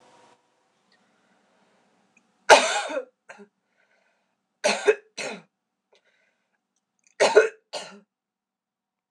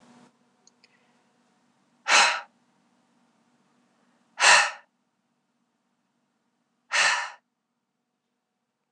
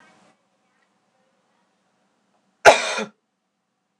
three_cough_length: 9.1 s
three_cough_amplitude: 26028
three_cough_signal_mean_std_ratio: 0.23
exhalation_length: 8.9 s
exhalation_amplitude: 20467
exhalation_signal_mean_std_ratio: 0.25
cough_length: 4.0 s
cough_amplitude: 26028
cough_signal_mean_std_ratio: 0.18
survey_phase: beta (2021-08-13 to 2022-03-07)
age: 18-44
gender: Female
wearing_mask: 'Yes'
symptom_cough_any: true
symptom_runny_or_blocked_nose: true
smoker_status: Never smoked
respiratory_condition_asthma: false
respiratory_condition_other: false
recruitment_source: Test and Trace
submission_delay: 1 day
covid_test_result: Positive
covid_test_method: RT-qPCR
covid_ct_value: 29.6
covid_ct_gene: N gene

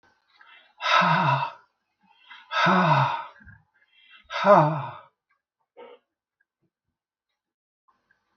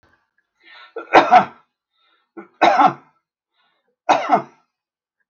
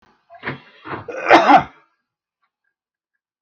exhalation_length: 8.4 s
exhalation_amplitude: 20041
exhalation_signal_mean_std_ratio: 0.38
three_cough_length: 5.3 s
three_cough_amplitude: 32768
three_cough_signal_mean_std_ratio: 0.32
cough_length: 3.4 s
cough_amplitude: 32768
cough_signal_mean_std_ratio: 0.3
survey_phase: beta (2021-08-13 to 2022-03-07)
age: 65+
gender: Male
wearing_mask: 'No'
symptom_none: true
smoker_status: Never smoked
respiratory_condition_asthma: false
respiratory_condition_other: false
recruitment_source: REACT
submission_delay: 1 day
covid_test_result: Negative
covid_test_method: RT-qPCR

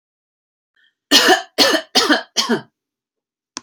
cough_length: 3.6 s
cough_amplitude: 32767
cough_signal_mean_std_ratio: 0.41
survey_phase: beta (2021-08-13 to 2022-03-07)
age: 18-44
gender: Female
wearing_mask: 'No'
symptom_none: true
smoker_status: Never smoked
respiratory_condition_asthma: false
respiratory_condition_other: false
recruitment_source: REACT
submission_delay: 2 days
covid_test_result: Negative
covid_test_method: RT-qPCR
influenza_a_test_result: Negative
influenza_b_test_result: Negative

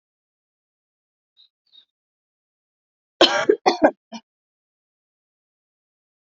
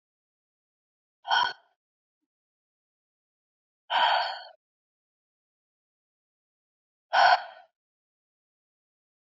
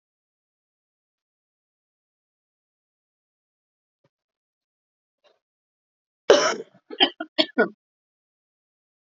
cough_length: 6.3 s
cough_amplitude: 28394
cough_signal_mean_std_ratio: 0.2
exhalation_length: 9.2 s
exhalation_amplitude: 13445
exhalation_signal_mean_std_ratio: 0.25
three_cough_length: 9.0 s
three_cough_amplitude: 32767
three_cough_signal_mean_std_ratio: 0.17
survey_phase: alpha (2021-03-01 to 2021-08-12)
age: 18-44
gender: Female
wearing_mask: 'No'
symptom_cough_any: true
symptom_fatigue: true
symptom_headache: true
symptom_onset: 3 days
smoker_status: Never smoked
respiratory_condition_asthma: false
respiratory_condition_other: false
recruitment_source: Test and Trace
submission_delay: 2 days
covid_test_result: Positive
covid_test_method: RT-qPCR
covid_ct_value: 13.8
covid_ct_gene: N gene
covid_ct_mean: 14.3
covid_viral_load: 20000000 copies/ml
covid_viral_load_category: High viral load (>1M copies/ml)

